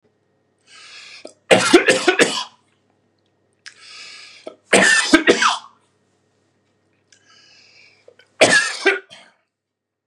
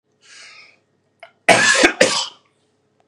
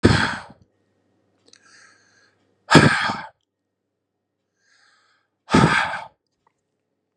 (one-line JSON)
{"three_cough_length": "10.1 s", "three_cough_amplitude": 32768, "three_cough_signal_mean_std_ratio": 0.35, "cough_length": "3.1 s", "cough_amplitude": 32768, "cough_signal_mean_std_ratio": 0.37, "exhalation_length": "7.2 s", "exhalation_amplitude": 32768, "exhalation_signal_mean_std_ratio": 0.3, "survey_phase": "beta (2021-08-13 to 2022-03-07)", "age": "45-64", "gender": "Male", "wearing_mask": "No", "symptom_none": true, "symptom_onset": "12 days", "smoker_status": "Never smoked", "respiratory_condition_asthma": false, "respiratory_condition_other": false, "recruitment_source": "REACT", "submission_delay": "1 day", "covid_test_result": "Negative", "covid_test_method": "RT-qPCR", "influenza_a_test_result": "Negative", "influenza_b_test_result": "Negative"}